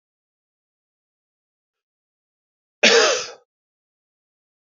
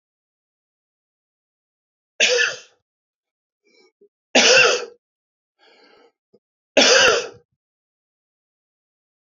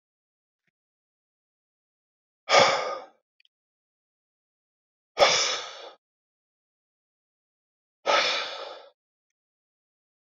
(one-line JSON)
{"cough_length": "4.7 s", "cough_amplitude": 29384, "cough_signal_mean_std_ratio": 0.23, "three_cough_length": "9.2 s", "three_cough_amplitude": 28905, "three_cough_signal_mean_std_ratio": 0.3, "exhalation_length": "10.3 s", "exhalation_amplitude": 20983, "exhalation_signal_mean_std_ratio": 0.27, "survey_phase": "beta (2021-08-13 to 2022-03-07)", "age": "45-64", "gender": "Male", "wearing_mask": "No", "symptom_cough_any": true, "symptom_headache": true, "symptom_change_to_sense_of_smell_or_taste": true, "symptom_onset": "2 days", "smoker_status": "Never smoked", "respiratory_condition_asthma": false, "respiratory_condition_other": false, "recruitment_source": "Test and Trace", "submission_delay": "1 day", "covid_test_result": "Positive", "covid_test_method": "ePCR"}